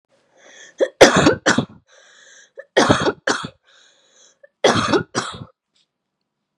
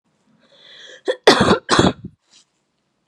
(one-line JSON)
{"three_cough_length": "6.6 s", "three_cough_amplitude": 32768, "three_cough_signal_mean_std_ratio": 0.36, "cough_length": "3.1 s", "cough_amplitude": 32768, "cough_signal_mean_std_ratio": 0.35, "survey_phase": "beta (2021-08-13 to 2022-03-07)", "age": "18-44", "gender": "Female", "wearing_mask": "No", "symptom_cough_any": true, "symptom_onset": "11 days", "smoker_status": "Never smoked", "respiratory_condition_asthma": true, "respiratory_condition_other": false, "recruitment_source": "REACT", "submission_delay": "31 days", "covid_test_result": "Negative", "covid_test_method": "RT-qPCR", "influenza_a_test_result": "Unknown/Void", "influenza_b_test_result": "Unknown/Void"}